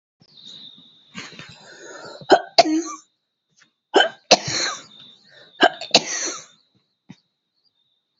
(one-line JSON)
{"three_cough_length": "8.2 s", "three_cough_amplitude": 32768, "three_cough_signal_mean_std_ratio": 0.3, "survey_phase": "beta (2021-08-13 to 2022-03-07)", "age": "45-64", "gender": "Female", "wearing_mask": "No", "symptom_none": true, "smoker_status": "Never smoked", "respiratory_condition_asthma": true, "respiratory_condition_other": false, "recruitment_source": "REACT", "submission_delay": "1 day", "covid_test_result": "Negative", "covid_test_method": "RT-qPCR"}